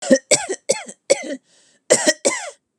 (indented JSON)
{
  "cough_length": "2.8 s",
  "cough_amplitude": 32767,
  "cough_signal_mean_std_ratio": 0.42,
  "survey_phase": "beta (2021-08-13 to 2022-03-07)",
  "age": "45-64",
  "gender": "Female",
  "wearing_mask": "No",
  "symptom_none": true,
  "symptom_onset": "12 days",
  "smoker_status": "Never smoked",
  "respiratory_condition_asthma": false,
  "respiratory_condition_other": false,
  "recruitment_source": "REACT",
  "submission_delay": "1 day",
  "covid_test_result": "Negative",
  "covid_test_method": "RT-qPCR",
  "influenza_a_test_result": "Negative",
  "influenza_b_test_result": "Negative"
}